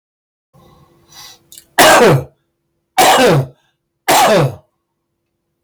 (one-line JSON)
{"three_cough_length": "5.6 s", "three_cough_amplitude": 32768, "three_cough_signal_mean_std_ratio": 0.47, "survey_phase": "beta (2021-08-13 to 2022-03-07)", "age": "65+", "gender": "Male", "wearing_mask": "No", "symptom_cough_any": true, "symptom_shortness_of_breath": true, "symptom_sore_throat": true, "symptom_fatigue": true, "smoker_status": "Ex-smoker", "respiratory_condition_asthma": true, "respiratory_condition_other": false, "recruitment_source": "REACT", "submission_delay": "12 days", "covid_test_result": "Negative", "covid_test_method": "RT-qPCR", "influenza_a_test_result": "Negative", "influenza_b_test_result": "Negative"}